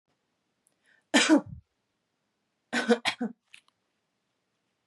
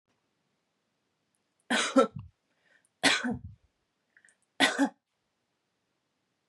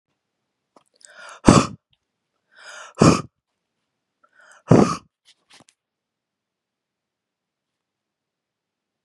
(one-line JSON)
{"cough_length": "4.9 s", "cough_amplitude": 14294, "cough_signal_mean_std_ratio": 0.27, "three_cough_length": "6.5 s", "three_cough_amplitude": 10852, "three_cough_signal_mean_std_ratio": 0.28, "exhalation_length": "9.0 s", "exhalation_amplitude": 32768, "exhalation_signal_mean_std_ratio": 0.2, "survey_phase": "beta (2021-08-13 to 2022-03-07)", "age": "18-44", "gender": "Female", "wearing_mask": "No", "symptom_none": true, "symptom_onset": "5 days", "smoker_status": "Never smoked", "respiratory_condition_asthma": false, "respiratory_condition_other": false, "recruitment_source": "REACT", "submission_delay": "1 day", "covid_test_result": "Negative", "covid_test_method": "RT-qPCR", "influenza_a_test_result": "Negative", "influenza_b_test_result": "Negative"}